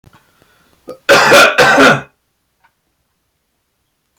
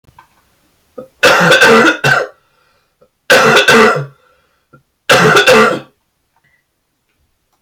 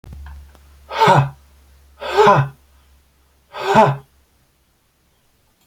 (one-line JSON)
{"cough_length": "4.2 s", "cough_amplitude": 32768, "cough_signal_mean_std_ratio": 0.42, "three_cough_length": "7.6 s", "three_cough_amplitude": 32768, "three_cough_signal_mean_std_ratio": 0.52, "exhalation_length": "5.7 s", "exhalation_amplitude": 29864, "exhalation_signal_mean_std_ratio": 0.37, "survey_phase": "beta (2021-08-13 to 2022-03-07)", "age": "18-44", "gender": "Male", "wearing_mask": "No", "symptom_none": true, "smoker_status": "Never smoked", "respiratory_condition_asthma": false, "respiratory_condition_other": false, "recruitment_source": "REACT", "submission_delay": "1 day", "covid_test_result": "Negative", "covid_test_method": "RT-qPCR"}